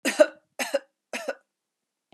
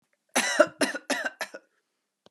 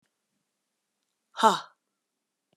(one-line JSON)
{"three_cough_length": "2.1 s", "three_cough_amplitude": 22453, "three_cough_signal_mean_std_ratio": 0.28, "cough_length": "2.3 s", "cough_amplitude": 19735, "cough_signal_mean_std_ratio": 0.38, "exhalation_length": "2.6 s", "exhalation_amplitude": 17791, "exhalation_signal_mean_std_ratio": 0.19, "survey_phase": "beta (2021-08-13 to 2022-03-07)", "age": "45-64", "gender": "Female", "wearing_mask": "No", "symptom_none": true, "smoker_status": "Never smoked", "respiratory_condition_asthma": false, "respiratory_condition_other": false, "recruitment_source": "REACT", "submission_delay": "3 days", "covid_test_result": "Negative", "covid_test_method": "RT-qPCR", "influenza_a_test_result": "Negative", "influenza_b_test_result": "Negative"}